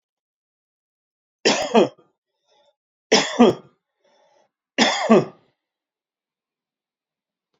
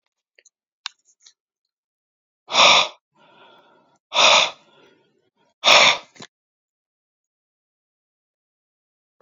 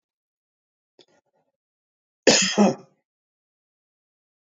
{"three_cough_length": "7.6 s", "three_cough_amplitude": 27980, "three_cough_signal_mean_std_ratio": 0.28, "exhalation_length": "9.2 s", "exhalation_amplitude": 32768, "exhalation_signal_mean_std_ratio": 0.26, "cough_length": "4.4 s", "cough_amplitude": 28307, "cough_signal_mean_std_ratio": 0.24, "survey_phase": "alpha (2021-03-01 to 2021-08-12)", "age": "45-64", "gender": "Male", "wearing_mask": "No", "symptom_none": true, "smoker_status": "Ex-smoker", "respiratory_condition_asthma": false, "respiratory_condition_other": false, "recruitment_source": "REACT", "submission_delay": "3 days", "covid_test_result": "Negative", "covid_test_method": "RT-qPCR"}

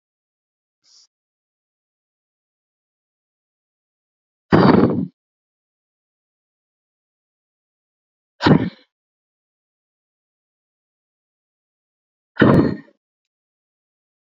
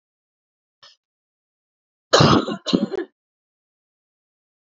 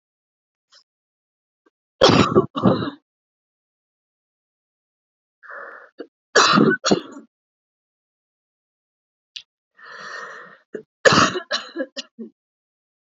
{"exhalation_length": "14.3 s", "exhalation_amplitude": 32767, "exhalation_signal_mean_std_ratio": 0.21, "cough_length": "4.7 s", "cough_amplitude": 32768, "cough_signal_mean_std_ratio": 0.27, "three_cough_length": "13.1 s", "three_cough_amplitude": 29802, "three_cough_signal_mean_std_ratio": 0.29, "survey_phase": "beta (2021-08-13 to 2022-03-07)", "age": "18-44", "gender": "Female", "wearing_mask": "No", "symptom_cough_any": true, "symptom_runny_or_blocked_nose": true, "symptom_shortness_of_breath": true, "symptom_fatigue": true, "symptom_loss_of_taste": true, "symptom_onset": "7 days", "smoker_status": "Never smoked", "respiratory_condition_asthma": false, "respiratory_condition_other": false, "recruitment_source": "Test and Trace", "submission_delay": "1 day", "covid_test_result": "Positive", "covid_test_method": "RT-qPCR", "covid_ct_value": 23.5, "covid_ct_gene": "ORF1ab gene", "covid_ct_mean": 23.8, "covid_viral_load": "16000 copies/ml", "covid_viral_load_category": "Low viral load (10K-1M copies/ml)"}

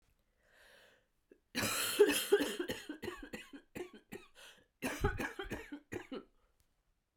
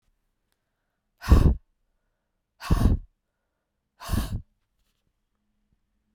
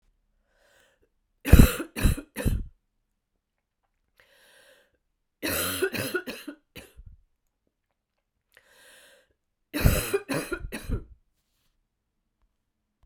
{"cough_length": "7.2 s", "cough_amplitude": 5654, "cough_signal_mean_std_ratio": 0.41, "exhalation_length": "6.1 s", "exhalation_amplitude": 20261, "exhalation_signal_mean_std_ratio": 0.27, "three_cough_length": "13.1 s", "three_cough_amplitude": 31055, "three_cough_signal_mean_std_ratio": 0.26, "survey_phase": "beta (2021-08-13 to 2022-03-07)", "age": "45-64", "gender": "Female", "wearing_mask": "No", "symptom_cough_any": true, "symptom_runny_or_blocked_nose": true, "symptom_sore_throat": true, "symptom_fatigue": true, "symptom_headache": true, "symptom_onset": "2 days", "smoker_status": "Ex-smoker", "respiratory_condition_asthma": false, "respiratory_condition_other": false, "recruitment_source": "Test and Trace", "submission_delay": "1 day", "covid_test_result": "Positive", "covid_test_method": "RT-qPCR", "covid_ct_value": 19.2, "covid_ct_gene": "ORF1ab gene", "covid_ct_mean": 20.0, "covid_viral_load": "270000 copies/ml", "covid_viral_load_category": "Low viral load (10K-1M copies/ml)"}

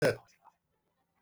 {"three_cough_length": "1.2 s", "three_cough_amplitude": 5526, "three_cough_signal_mean_std_ratio": 0.27, "survey_phase": "beta (2021-08-13 to 2022-03-07)", "age": "65+", "gender": "Male", "wearing_mask": "No", "symptom_none": true, "smoker_status": "Ex-smoker", "respiratory_condition_asthma": false, "respiratory_condition_other": false, "recruitment_source": "REACT", "submission_delay": "2 days", "covid_test_result": "Negative", "covid_test_method": "RT-qPCR"}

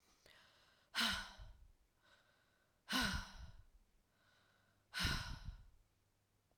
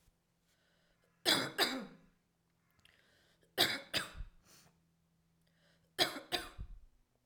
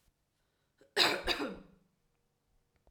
{"exhalation_length": "6.6 s", "exhalation_amplitude": 1818, "exhalation_signal_mean_std_ratio": 0.39, "three_cough_length": "7.3 s", "three_cough_amplitude": 5585, "three_cough_signal_mean_std_ratio": 0.32, "cough_length": "2.9 s", "cough_amplitude": 8624, "cough_signal_mean_std_ratio": 0.32, "survey_phase": "beta (2021-08-13 to 2022-03-07)", "age": "18-44", "gender": "Female", "wearing_mask": "No", "symptom_cough_any": true, "symptom_runny_or_blocked_nose": true, "symptom_onset": "3 days", "smoker_status": "Never smoked", "respiratory_condition_asthma": false, "respiratory_condition_other": false, "recruitment_source": "Test and Trace", "submission_delay": "2 days", "covid_test_result": "Positive", "covid_test_method": "RT-qPCR"}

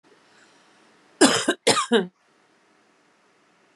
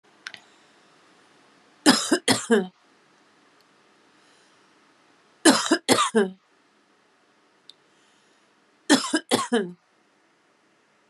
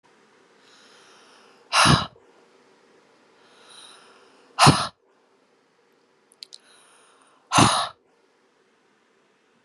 {"cough_length": "3.8 s", "cough_amplitude": 31511, "cough_signal_mean_std_ratio": 0.31, "three_cough_length": "11.1 s", "three_cough_amplitude": 30471, "three_cough_signal_mean_std_ratio": 0.31, "exhalation_length": "9.6 s", "exhalation_amplitude": 29436, "exhalation_signal_mean_std_ratio": 0.25, "survey_phase": "beta (2021-08-13 to 2022-03-07)", "age": "45-64", "gender": "Female", "wearing_mask": "No", "symptom_none": true, "smoker_status": "Current smoker (11 or more cigarettes per day)", "respiratory_condition_asthma": false, "respiratory_condition_other": false, "recruitment_source": "REACT", "submission_delay": "3 days", "covid_test_result": "Negative", "covid_test_method": "RT-qPCR"}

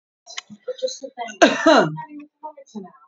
{"three_cough_length": "3.1 s", "three_cough_amplitude": 27432, "three_cough_signal_mean_std_ratio": 0.39, "survey_phase": "alpha (2021-03-01 to 2021-08-12)", "age": "18-44", "gender": "Female", "wearing_mask": "No", "symptom_none": true, "symptom_cough_any": true, "smoker_status": "Current smoker (e-cigarettes or vapes only)", "respiratory_condition_asthma": false, "respiratory_condition_other": false, "recruitment_source": "REACT", "submission_delay": "2 days", "covid_test_result": "Negative", "covid_test_method": "RT-qPCR"}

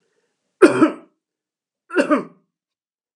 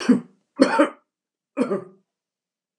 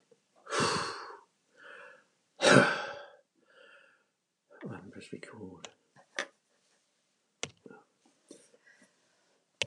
{"three_cough_length": "3.2 s", "three_cough_amplitude": 32768, "three_cough_signal_mean_std_ratio": 0.3, "cough_length": "2.8 s", "cough_amplitude": 30044, "cough_signal_mean_std_ratio": 0.36, "exhalation_length": "9.7 s", "exhalation_amplitude": 18289, "exhalation_signal_mean_std_ratio": 0.26, "survey_phase": "beta (2021-08-13 to 2022-03-07)", "age": "65+", "gender": "Male", "wearing_mask": "No", "symptom_none": true, "smoker_status": "Never smoked", "respiratory_condition_asthma": false, "respiratory_condition_other": false, "recruitment_source": "REACT", "submission_delay": "1 day", "covid_test_result": "Negative", "covid_test_method": "RT-qPCR", "influenza_a_test_result": "Negative", "influenza_b_test_result": "Negative"}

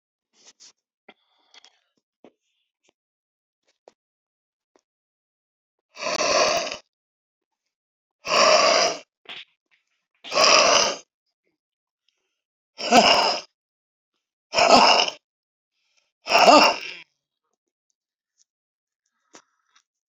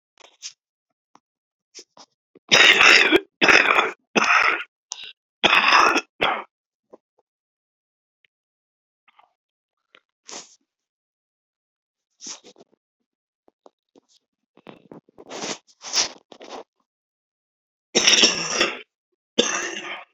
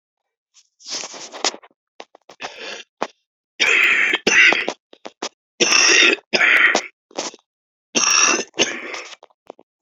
{"exhalation_length": "20.1 s", "exhalation_amplitude": 31490, "exhalation_signal_mean_std_ratio": 0.32, "cough_length": "20.1 s", "cough_amplitude": 32767, "cough_signal_mean_std_ratio": 0.32, "three_cough_length": "9.8 s", "three_cough_amplitude": 31154, "three_cough_signal_mean_std_ratio": 0.47, "survey_phase": "beta (2021-08-13 to 2022-03-07)", "age": "65+", "gender": "Female", "wearing_mask": "No", "symptom_cough_any": true, "symptom_runny_or_blocked_nose": true, "symptom_shortness_of_breath": true, "symptom_sore_throat": true, "symptom_onset": "7 days", "smoker_status": "Ex-smoker", "respiratory_condition_asthma": true, "respiratory_condition_other": true, "recruitment_source": "Test and Trace", "submission_delay": "1 day", "covid_test_result": "Negative", "covid_test_method": "RT-qPCR"}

